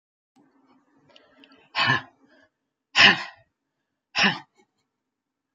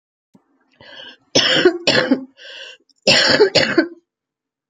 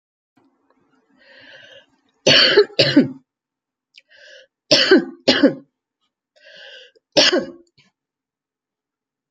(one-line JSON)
{"exhalation_length": "5.5 s", "exhalation_amplitude": 27321, "exhalation_signal_mean_std_ratio": 0.26, "cough_length": "4.7 s", "cough_amplitude": 32767, "cough_signal_mean_std_ratio": 0.47, "three_cough_length": "9.3 s", "three_cough_amplitude": 32767, "three_cough_signal_mean_std_ratio": 0.32, "survey_phase": "beta (2021-08-13 to 2022-03-07)", "age": "45-64", "gender": "Female", "wearing_mask": "No", "symptom_cough_any": true, "symptom_runny_or_blocked_nose": true, "symptom_onset": "4 days", "smoker_status": "Ex-smoker", "respiratory_condition_asthma": true, "respiratory_condition_other": true, "recruitment_source": "Test and Trace", "submission_delay": "1 day", "covid_test_result": "Negative", "covid_test_method": "RT-qPCR"}